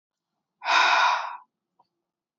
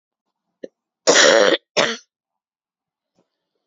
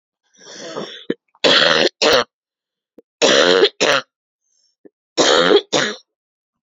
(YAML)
exhalation_length: 2.4 s
exhalation_amplitude: 13085
exhalation_signal_mean_std_ratio: 0.43
cough_length: 3.7 s
cough_amplitude: 31754
cough_signal_mean_std_ratio: 0.33
three_cough_length: 6.7 s
three_cough_amplitude: 32767
three_cough_signal_mean_std_ratio: 0.46
survey_phase: beta (2021-08-13 to 2022-03-07)
age: 18-44
gender: Female
wearing_mask: 'Yes'
symptom_new_continuous_cough: true
symptom_runny_or_blocked_nose: true
symptom_sore_throat: true
symptom_diarrhoea: true
symptom_fatigue: true
symptom_fever_high_temperature: true
symptom_headache: true
symptom_other: true
symptom_onset: 3 days
smoker_status: Never smoked
respiratory_condition_asthma: true
respiratory_condition_other: false
recruitment_source: Test and Trace
submission_delay: 2 days
covid_test_result: Positive
covid_test_method: ePCR